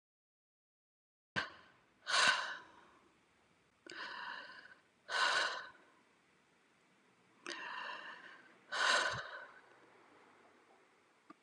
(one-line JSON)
{"exhalation_length": "11.4 s", "exhalation_amplitude": 5373, "exhalation_signal_mean_std_ratio": 0.38, "survey_phase": "alpha (2021-03-01 to 2021-08-12)", "age": "45-64", "gender": "Female", "wearing_mask": "No", "symptom_none": true, "smoker_status": "Never smoked", "respiratory_condition_asthma": false, "respiratory_condition_other": false, "recruitment_source": "REACT", "submission_delay": "2 days", "covid_test_result": "Negative", "covid_test_method": "RT-qPCR"}